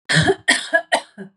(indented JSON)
{
  "three_cough_length": "1.4 s",
  "three_cough_amplitude": 29408,
  "three_cough_signal_mean_std_ratio": 0.56,
  "survey_phase": "beta (2021-08-13 to 2022-03-07)",
  "age": "18-44",
  "gender": "Female",
  "wearing_mask": "No",
  "symptom_none": true,
  "smoker_status": "Never smoked",
  "respiratory_condition_asthma": false,
  "respiratory_condition_other": false,
  "recruitment_source": "REACT",
  "submission_delay": "1 day",
  "covid_test_result": "Negative",
  "covid_test_method": "RT-qPCR",
  "influenza_a_test_result": "Negative",
  "influenza_b_test_result": "Negative"
}